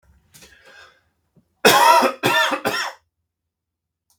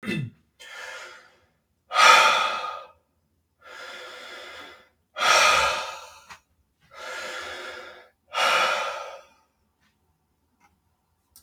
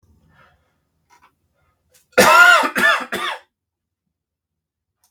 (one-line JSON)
{"three_cough_length": "4.2 s", "three_cough_amplitude": 32767, "three_cough_signal_mean_std_ratio": 0.4, "exhalation_length": "11.4 s", "exhalation_amplitude": 26169, "exhalation_signal_mean_std_ratio": 0.39, "cough_length": "5.1 s", "cough_amplitude": 32768, "cough_signal_mean_std_ratio": 0.33, "survey_phase": "beta (2021-08-13 to 2022-03-07)", "age": "18-44", "gender": "Male", "wearing_mask": "No", "symptom_none": true, "smoker_status": "Never smoked", "respiratory_condition_asthma": false, "respiratory_condition_other": false, "recruitment_source": "REACT", "submission_delay": "4 days", "covid_test_result": "Negative", "covid_test_method": "RT-qPCR", "influenza_a_test_result": "Negative", "influenza_b_test_result": "Negative"}